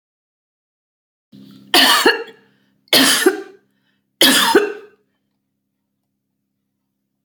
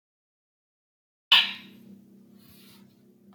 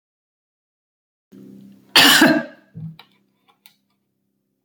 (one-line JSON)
{"three_cough_length": "7.2 s", "three_cough_amplitude": 32768, "three_cough_signal_mean_std_ratio": 0.36, "exhalation_length": "3.3 s", "exhalation_amplitude": 18071, "exhalation_signal_mean_std_ratio": 0.2, "cough_length": "4.6 s", "cough_amplitude": 30849, "cough_signal_mean_std_ratio": 0.27, "survey_phase": "beta (2021-08-13 to 2022-03-07)", "age": "65+", "gender": "Female", "wearing_mask": "No", "symptom_none": true, "smoker_status": "Ex-smoker", "respiratory_condition_asthma": false, "respiratory_condition_other": false, "recruitment_source": "REACT", "submission_delay": "1 day", "covid_test_result": "Negative", "covid_test_method": "RT-qPCR"}